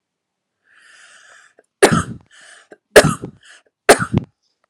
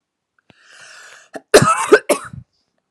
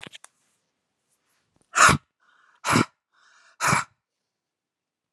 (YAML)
three_cough_length: 4.7 s
three_cough_amplitude: 32768
three_cough_signal_mean_std_ratio: 0.26
cough_length: 2.9 s
cough_amplitude: 32768
cough_signal_mean_std_ratio: 0.31
exhalation_length: 5.1 s
exhalation_amplitude: 26007
exhalation_signal_mean_std_ratio: 0.26
survey_phase: beta (2021-08-13 to 2022-03-07)
age: 18-44
gender: Female
wearing_mask: 'No'
symptom_none: true
smoker_status: Never smoked
respiratory_condition_asthma: false
respiratory_condition_other: false
recruitment_source: REACT
submission_delay: 2 days
covid_test_result: Negative
covid_test_method: RT-qPCR